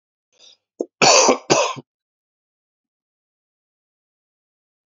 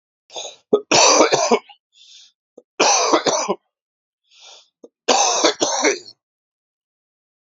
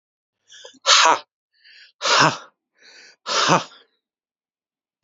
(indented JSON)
{
  "cough_length": "4.9 s",
  "cough_amplitude": 32767,
  "cough_signal_mean_std_ratio": 0.27,
  "three_cough_length": "7.5 s",
  "three_cough_amplitude": 32767,
  "three_cough_signal_mean_std_ratio": 0.44,
  "exhalation_length": "5.0 s",
  "exhalation_amplitude": 32768,
  "exhalation_signal_mean_std_ratio": 0.34,
  "survey_phase": "alpha (2021-03-01 to 2021-08-12)",
  "age": "45-64",
  "gender": "Male",
  "wearing_mask": "No",
  "symptom_cough_any": true,
  "symptom_new_continuous_cough": true,
  "symptom_shortness_of_breath": true,
  "symptom_diarrhoea": true,
  "symptom_fatigue": true,
  "symptom_headache": true,
  "symptom_change_to_sense_of_smell_or_taste": true,
  "symptom_loss_of_taste": true,
  "symptom_onset": "5 days",
  "smoker_status": "Never smoked",
  "respiratory_condition_asthma": true,
  "respiratory_condition_other": false,
  "recruitment_source": "Test and Trace",
  "submission_delay": "2 days",
  "covid_test_result": "Positive",
  "covid_test_method": "RT-qPCR",
  "covid_ct_value": 17.9,
  "covid_ct_gene": "ORF1ab gene",
  "covid_ct_mean": 18.2,
  "covid_viral_load": "1100000 copies/ml",
  "covid_viral_load_category": "High viral load (>1M copies/ml)"
}